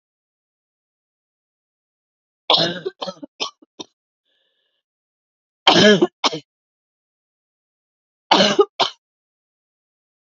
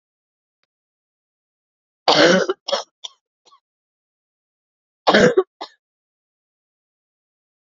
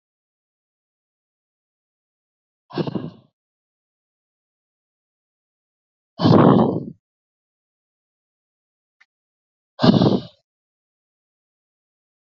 {"three_cough_length": "10.3 s", "three_cough_amplitude": 30063, "three_cough_signal_mean_std_ratio": 0.26, "cough_length": "7.8 s", "cough_amplitude": 28436, "cough_signal_mean_std_ratio": 0.26, "exhalation_length": "12.3 s", "exhalation_amplitude": 27643, "exhalation_signal_mean_std_ratio": 0.23, "survey_phase": "beta (2021-08-13 to 2022-03-07)", "age": "18-44", "gender": "Female", "wearing_mask": "No", "symptom_cough_any": true, "symptom_runny_or_blocked_nose": true, "symptom_sore_throat": true, "symptom_headache": true, "symptom_change_to_sense_of_smell_or_taste": true, "symptom_loss_of_taste": true, "symptom_onset": "4 days", "smoker_status": "Never smoked", "respiratory_condition_asthma": false, "respiratory_condition_other": false, "recruitment_source": "Test and Trace", "submission_delay": "2 days", "covid_test_result": "Positive", "covid_test_method": "RT-qPCR", "covid_ct_value": 16.9, "covid_ct_gene": "ORF1ab gene", "covid_ct_mean": 17.2, "covid_viral_load": "2300000 copies/ml", "covid_viral_load_category": "High viral load (>1M copies/ml)"}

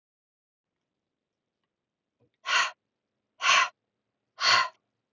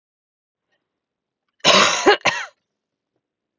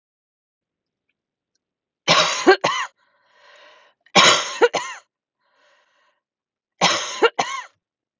{"exhalation_length": "5.1 s", "exhalation_amplitude": 11116, "exhalation_signal_mean_std_ratio": 0.3, "cough_length": "3.6 s", "cough_amplitude": 31135, "cough_signal_mean_std_ratio": 0.32, "three_cough_length": "8.2 s", "three_cough_amplitude": 32768, "three_cough_signal_mean_std_ratio": 0.33, "survey_phase": "beta (2021-08-13 to 2022-03-07)", "age": "18-44", "gender": "Female", "wearing_mask": "No", "symptom_none": true, "smoker_status": "Never smoked", "respiratory_condition_asthma": false, "respiratory_condition_other": false, "recruitment_source": "REACT", "submission_delay": "2 days", "covid_test_result": "Negative", "covid_test_method": "RT-qPCR"}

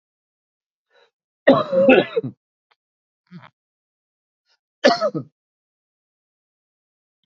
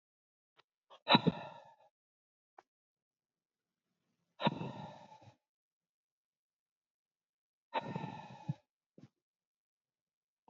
{"cough_length": "7.3 s", "cough_amplitude": 31866, "cough_signal_mean_std_ratio": 0.26, "exhalation_length": "10.5 s", "exhalation_amplitude": 9192, "exhalation_signal_mean_std_ratio": 0.2, "survey_phase": "alpha (2021-03-01 to 2021-08-12)", "age": "45-64", "gender": "Male", "wearing_mask": "No", "symptom_cough_any": true, "smoker_status": "Ex-smoker", "respiratory_condition_asthma": false, "respiratory_condition_other": false, "recruitment_source": "Test and Trace", "submission_delay": "2 days", "covid_test_result": "Positive", "covid_test_method": "RT-qPCR", "covid_ct_value": 15.0, "covid_ct_gene": "ORF1ab gene", "covid_ct_mean": 15.1, "covid_viral_load": "11000000 copies/ml", "covid_viral_load_category": "High viral load (>1M copies/ml)"}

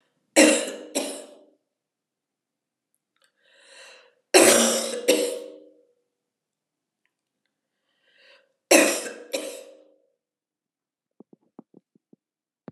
{"three_cough_length": "12.7 s", "three_cough_amplitude": 30258, "three_cough_signal_mean_std_ratio": 0.28, "survey_phase": "alpha (2021-03-01 to 2021-08-12)", "age": "65+", "gender": "Female", "wearing_mask": "No", "symptom_cough_any": true, "smoker_status": "Never smoked", "respiratory_condition_asthma": false, "respiratory_condition_other": false, "recruitment_source": "Test and Trace", "submission_delay": "0 days", "covid_test_result": "Negative", "covid_test_method": "LFT"}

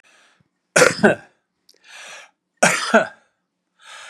{"cough_length": "4.1 s", "cough_amplitude": 32768, "cough_signal_mean_std_ratio": 0.32, "survey_phase": "beta (2021-08-13 to 2022-03-07)", "age": "65+", "gender": "Male", "wearing_mask": "No", "symptom_none": true, "smoker_status": "Never smoked", "respiratory_condition_asthma": false, "respiratory_condition_other": false, "recruitment_source": "REACT", "submission_delay": "3 days", "covid_test_result": "Negative", "covid_test_method": "RT-qPCR", "influenza_a_test_result": "Negative", "influenza_b_test_result": "Negative"}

